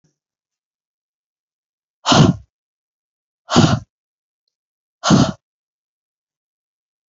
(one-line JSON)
{"exhalation_length": "7.1 s", "exhalation_amplitude": 31270, "exhalation_signal_mean_std_ratio": 0.26, "survey_phase": "beta (2021-08-13 to 2022-03-07)", "age": "18-44", "gender": "Male", "wearing_mask": "No", "symptom_cough_any": true, "symptom_new_continuous_cough": true, "symptom_runny_or_blocked_nose": true, "symptom_shortness_of_breath": true, "symptom_sore_throat": true, "symptom_fatigue": true, "symptom_headache": true, "symptom_change_to_sense_of_smell_or_taste": true, "symptom_loss_of_taste": true, "smoker_status": "Never smoked", "respiratory_condition_asthma": false, "respiratory_condition_other": false, "recruitment_source": "Test and Trace", "submission_delay": "2 days", "covid_test_result": "Positive", "covid_test_method": "LFT"}